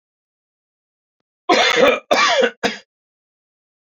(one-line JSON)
{"cough_length": "3.9 s", "cough_amplitude": 28214, "cough_signal_mean_std_ratio": 0.41, "survey_phase": "beta (2021-08-13 to 2022-03-07)", "age": "45-64", "gender": "Male", "wearing_mask": "No", "symptom_cough_any": true, "symptom_runny_or_blocked_nose": true, "symptom_fatigue": true, "symptom_headache": true, "symptom_change_to_sense_of_smell_or_taste": true, "symptom_loss_of_taste": true, "symptom_onset": "3 days", "smoker_status": "Never smoked", "respiratory_condition_asthma": false, "respiratory_condition_other": false, "recruitment_source": "Test and Trace", "submission_delay": "1 day", "covid_test_result": "Positive", "covid_test_method": "RT-qPCR"}